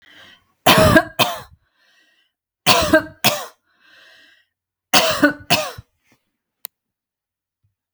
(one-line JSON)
{"three_cough_length": "7.9 s", "three_cough_amplitude": 32768, "three_cough_signal_mean_std_ratio": 0.34, "survey_phase": "beta (2021-08-13 to 2022-03-07)", "age": "45-64", "gender": "Female", "wearing_mask": "No", "symptom_none": true, "smoker_status": "Never smoked", "respiratory_condition_asthma": true, "respiratory_condition_other": false, "recruitment_source": "REACT", "submission_delay": "2 days", "covid_test_result": "Negative", "covid_test_method": "RT-qPCR"}